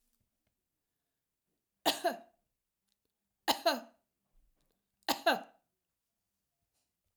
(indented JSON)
{
  "three_cough_length": "7.2 s",
  "three_cough_amplitude": 6984,
  "three_cough_signal_mean_std_ratio": 0.23,
  "survey_phase": "alpha (2021-03-01 to 2021-08-12)",
  "age": "65+",
  "gender": "Female",
  "wearing_mask": "No",
  "symptom_abdominal_pain": true,
  "symptom_change_to_sense_of_smell_or_taste": true,
  "symptom_onset": "13 days",
  "smoker_status": "Never smoked",
  "respiratory_condition_asthma": false,
  "respiratory_condition_other": false,
  "recruitment_source": "REACT",
  "submission_delay": "1 day",
  "covid_test_result": "Negative",
  "covid_test_method": "RT-qPCR"
}